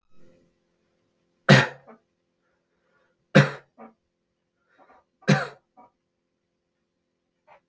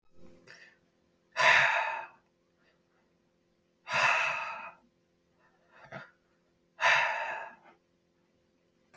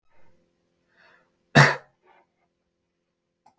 {"three_cough_length": "7.7 s", "three_cough_amplitude": 30217, "three_cough_signal_mean_std_ratio": 0.19, "exhalation_length": "9.0 s", "exhalation_amplitude": 10252, "exhalation_signal_mean_std_ratio": 0.37, "cough_length": "3.6 s", "cough_amplitude": 29260, "cough_signal_mean_std_ratio": 0.18, "survey_phase": "beta (2021-08-13 to 2022-03-07)", "age": "18-44", "gender": "Male", "wearing_mask": "No", "symptom_fatigue": true, "symptom_headache": true, "smoker_status": "Never smoked", "respiratory_condition_asthma": false, "respiratory_condition_other": false, "recruitment_source": "Test and Trace", "submission_delay": "2 days", "covid_test_result": "Positive", "covid_test_method": "RT-qPCR", "covid_ct_value": 15.8, "covid_ct_gene": "ORF1ab gene", "covid_ct_mean": 16.9, "covid_viral_load": "2900000 copies/ml", "covid_viral_load_category": "High viral load (>1M copies/ml)"}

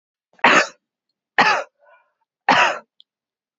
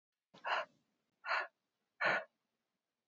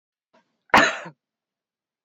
{"three_cough_length": "3.6 s", "three_cough_amplitude": 28832, "three_cough_signal_mean_std_ratio": 0.35, "exhalation_length": "3.1 s", "exhalation_amplitude": 3277, "exhalation_signal_mean_std_ratio": 0.36, "cough_length": "2.0 s", "cough_amplitude": 28266, "cough_signal_mean_std_ratio": 0.24, "survey_phase": "beta (2021-08-13 to 2022-03-07)", "age": "18-44", "gender": "Female", "wearing_mask": "No", "symptom_runny_or_blocked_nose": true, "symptom_onset": "13 days", "smoker_status": "Current smoker (1 to 10 cigarettes per day)", "respiratory_condition_asthma": false, "respiratory_condition_other": false, "recruitment_source": "REACT", "submission_delay": "2 days", "covid_test_result": "Negative", "covid_test_method": "RT-qPCR", "influenza_a_test_result": "Negative", "influenza_b_test_result": "Negative"}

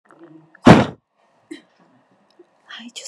{"exhalation_length": "3.1 s", "exhalation_amplitude": 32768, "exhalation_signal_mean_std_ratio": 0.22, "survey_phase": "beta (2021-08-13 to 2022-03-07)", "age": "18-44", "gender": "Female", "wearing_mask": "No", "symptom_none": true, "smoker_status": "Ex-smoker", "respiratory_condition_asthma": false, "respiratory_condition_other": false, "recruitment_source": "REACT", "submission_delay": "2 days", "covid_test_result": "Negative", "covid_test_method": "RT-qPCR", "influenza_a_test_result": "Negative", "influenza_b_test_result": "Negative"}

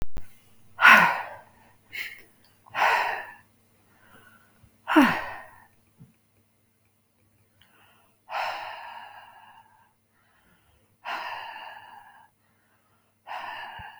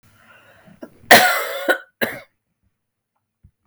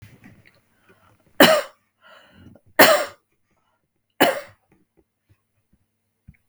{"exhalation_length": "14.0 s", "exhalation_amplitude": 27313, "exhalation_signal_mean_std_ratio": 0.31, "cough_length": "3.7 s", "cough_amplitude": 32768, "cough_signal_mean_std_ratio": 0.3, "three_cough_length": "6.5 s", "three_cough_amplitude": 32768, "three_cough_signal_mean_std_ratio": 0.24, "survey_phase": "beta (2021-08-13 to 2022-03-07)", "age": "45-64", "gender": "Female", "wearing_mask": "No", "symptom_cough_any": true, "symptom_runny_or_blocked_nose": true, "symptom_shortness_of_breath": true, "symptom_sore_throat": true, "symptom_fatigue": true, "symptom_change_to_sense_of_smell_or_taste": true, "smoker_status": "Never smoked", "respiratory_condition_asthma": true, "respiratory_condition_other": false, "recruitment_source": "REACT", "submission_delay": "3 days", "covid_test_result": "Negative", "covid_test_method": "RT-qPCR", "influenza_a_test_result": "Unknown/Void", "influenza_b_test_result": "Unknown/Void"}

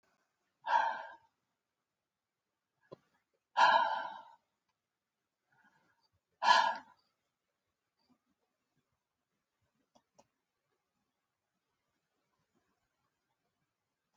{"exhalation_length": "14.2 s", "exhalation_amplitude": 7160, "exhalation_signal_mean_std_ratio": 0.22, "survey_phase": "alpha (2021-03-01 to 2021-08-12)", "age": "65+", "gender": "Female", "wearing_mask": "No", "symptom_none": true, "symptom_cough_any": true, "smoker_status": "Never smoked", "respiratory_condition_asthma": true, "respiratory_condition_other": false, "recruitment_source": "REACT", "submission_delay": "1 day", "covid_test_result": "Negative", "covid_test_method": "RT-qPCR"}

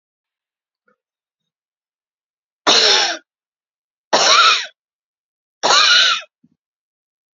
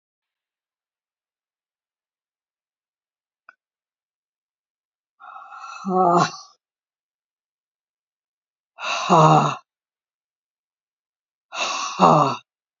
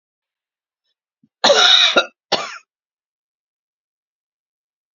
{"three_cough_length": "7.3 s", "three_cough_amplitude": 32767, "three_cough_signal_mean_std_ratio": 0.38, "exhalation_length": "12.8 s", "exhalation_amplitude": 27514, "exhalation_signal_mean_std_ratio": 0.28, "cough_length": "4.9 s", "cough_amplitude": 31468, "cough_signal_mean_std_ratio": 0.3, "survey_phase": "alpha (2021-03-01 to 2021-08-12)", "age": "65+", "gender": "Female", "wearing_mask": "No", "symptom_none": true, "smoker_status": "Never smoked", "respiratory_condition_asthma": false, "respiratory_condition_other": false, "recruitment_source": "REACT", "submission_delay": "1 day", "covid_test_result": "Negative", "covid_test_method": "RT-qPCR"}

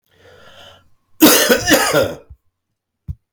{"cough_length": "3.3 s", "cough_amplitude": 32768, "cough_signal_mean_std_ratio": 0.43, "survey_phase": "beta (2021-08-13 to 2022-03-07)", "age": "45-64", "gender": "Male", "wearing_mask": "No", "symptom_cough_any": true, "symptom_runny_or_blocked_nose": true, "symptom_sore_throat": true, "smoker_status": "Ex-smoker", "respiratory_condition_asthma": false, "respiratory_condition_other": false, "recruitment_source": "REACT", "submission_delay": "4 days", "covid_test_result": "Negative", "covid_test_method": "RT-qPCR", "influenza_a_test_result": "Negative", "influenza_b_test_result": "Negative"}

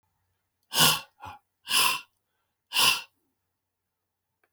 {"exhalation_length": "4.5 s", "exhalation_amplitude": 15850, "exhalation_signal_mean_std_ratio": 0.33, "survey_phase": "beta (2021-08-13 to 2022-03-07)", "age": "65+", "gender": "Male", "wearing_mask": "No", "symptom_cough_any": true, "smoker_status": "Current smoker (11 or more cigarettes per day)", "respiratory_condition_asthma": false, "respiratory_condition_other": false, "recruitment_source": "REACT", "submission_delay": "1 day", "covid_test_result": "Negative", "covid_test_method": "RT-qPCR"}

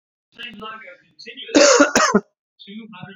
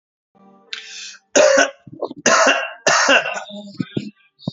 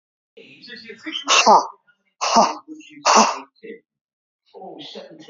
{"cough_length": "3.2 s", "cough_amplitude": 30958, "cough_signal_mean_std_ratio": 0.41, "three_cough_length": "4.5 s", "three_cough_amplitude": 32767, "three_cough_signal_mean_std_ratio": 0.49, "exhalation_length": "5.3 s", "exhalation_amplitude": 32280, "exhalation_signal_mean_std_ratio": 0.38, "survey_phase": "beta (2021-08-13 to 2022-03-07)", "age": "45-64", "gender": "Male", "wearing_mask": "No", "symptom_cough_any": true, "symptom_runny_or_blocked_nose": true, "symptom_sore_throat": true, "symptom_headache": true, "smoker_status": "Never smoked", "respiratory_condition_asthma": false, "respiratory_condition_other": false, "recruitment_source": "REACT", "submission_delay": "0 days", "covid_test_result": "Positive", "covid_test_method": "RT-qPCR", "covid_ct_value": 25.0, "covid_ct_gene": "E gene", "influenza_a_test_result": "Negative", "influenza_b_test_result": "Negative"}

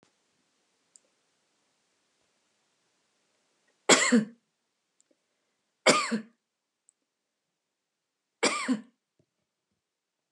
{"three_cough_length": "10.3 s", "three_cough_amplitude": 19274, "three_cough_signal_mean_std_ratio": 0.22, "survey_phase": "beta (2021-08-13 to 2022-03-07)", "age": "65+", "gender": "Female", "wearing_mask": "No", "symptom_none": true, "smoker_status": "Never smoked", "respiratory_condition_asthma": false, "respiratory_condition_other": false, "recruitment_source": "Test and Trace", "submission_delay": "-1 day", "covid_test_result": "Negative", "covid_test_method": "LFT"}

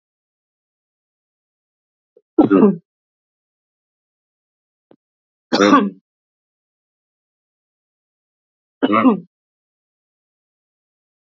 {"three_cough_length": "11.3 s", "three_cough_amplitude": 28688, "three_cough_signal_mean_std_ratio": 0.23, "survey_phase": "beta (2021-08-13 to 2022-03-07)", "age": "65+", "gender": "Female", "wearing_mask": "No", "symptom_cough_any": true, "symptom_runny_or_blocked_nose": true, "symptom_sore_throat": true, "symptom_change_to_sense_of_smell_or_taste": true, "symptom_onset": "7 days", "smoker_status": "Ex-smoker", "respiratory_condition_asthma": false, "respiratory_condition_other": true, "recruitment_source": "Test and Trace", "submission_delay": "1 day", "covid_test_result": "Positive", "covid_test_method": "RT-qPCR", "covid_ct_value": 18.2, "covid_ct_gene": "ORF1ab gene", "covid_ct_mean": 19.1, "covid_viral_load": "530000 copies/ml", "covid_viral_load_category": "Low viral load (10K-1M copies/ml)"}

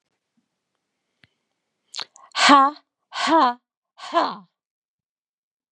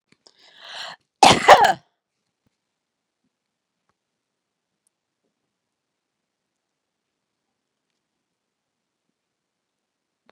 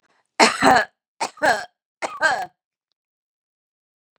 {"exhalation_length": "5.7 s", "exhalation_amplitude": 31204, "exhalation_signal_mean_std_ratio": 0.31, "cough_length": "10.3 s", "cough_amplitude": 32768, "cough_signal_mean_std_ratio": 0.15, "three_cough_length": "4.2 s", "three_cough_amplitude": 32767, "three_cough_signal_mean_std_ratio": 0.34, "survey_phase": "beta (2021-08-13 to 2022-03-07)", "age": "45-64", "gender": "Female", "wearing_mask": "No", "symptom_none": true, "smoker_status": "Never smoked", "respiratory_condition_asthma": false, "respiratory_condition_other": false, "recruitment_source": "REACT", "submission_delay": "1 day", "covid_test_result": "Negative", "covid_test_method": "RT-qPCR", "influenza_a_test_result": "Negative", "influenza_b_test_result": "Negative"}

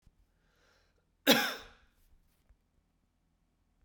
{"cough_length": "3.8 s", "cough_amplitude": 11660, "cough_signal_mean_std_ratio": 0.2, "survey_phase": "beta (2021-08-13 to 2022-03-07)", "age": "45-64", "gender": "Male", "wearing_mask": "No", "symptom_cough_any": true, "symptom_runny_or_blocked_nose": true, "symptom_fatigue": true, "symptom_change_to_sense_of_smell_or_taste": true, "symptom_loss_of_taste": true, "symptom_onset": "3 days", "smoker_status": "Ex-smoker", "respiratory_condition_asthma": false, "respiratory_condition_other": false, "recruitment_source": "Test and Trace", "submission_delay": "2 days", "covid_test_result": "Positive", "covid_test_method": "RT-qPCR", "covid_ct_value": 19.0, "covid_ct_gene": "ORF1ab gene", "covid_ct_mean": 19.6, "covid_viral_load": "370000 copies/ml", "covid_viral_load_category": "Low viral load (10K-1M copies/ml)"}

